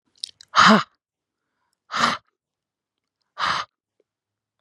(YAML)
exhalation_length: 4.6 s
exhalation_amplitude: 27634
exhalation_signal_mean_std_ratio: 0.28
survey_phase: beta (2021-08-13 to 2022-03-07)
age: 18-44
gender: Female
wearing_mask: 'No'
symptom_none: true
smoker_status: Current smoker (11 or more cigarettes per day)
respiratory_condition_asthma: false
respiratory_condition_other: false
recruitment_source: REACT
submission_delay: 0 days
covid_test_result: Negative
covid_test_method: RT-qPCR
influenza_a_test_result: Negative
influenza_b_test_result: Negative